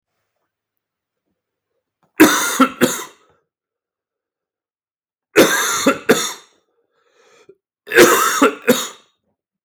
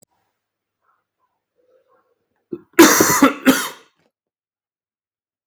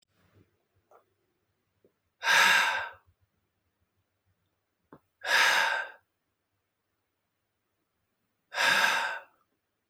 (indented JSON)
{
  "three_cough_length": "9.6 s",
  "three_cough_amplitude": 32644,
  "three_cough_signal_mean_std_ratio": 0.36,
  "cough_length": "5.5 s",
  "cough_amplitude": 32644,
  "cough_signal_mean_std_ratio": 0.28,
  "exhalation_length": "9.9 s",
  "exhalation_amplitude": 11222,
  "exhalation_signal_mean_std_ratio": 0.35,
  "survey_phase": "beta (2021-08-13 to 2022-03-07)",
  "age": "18-44",
  "gender": "Male",
  "wearing_mask": "No",
  "symptom_cough_any": true,
  "symptom_runny_or_blocked_nose": true,
  "symptom_fatigue": true,
  "symptom_onset": "4 days",
  "smoker_status": "Ex-smoker",
  "respiratory_condition_asthma": false,
  "respiratory_condition_other": false,
  "recruitment_source": "Test and Trace",
  "submission_delay": "2 days",
  "covid_test_result": "Positive",
  "covid_test_method": "RT-qPCR",
  "covid_ct_value": 16.4,
  "covid_ct_gene": "N gene"
}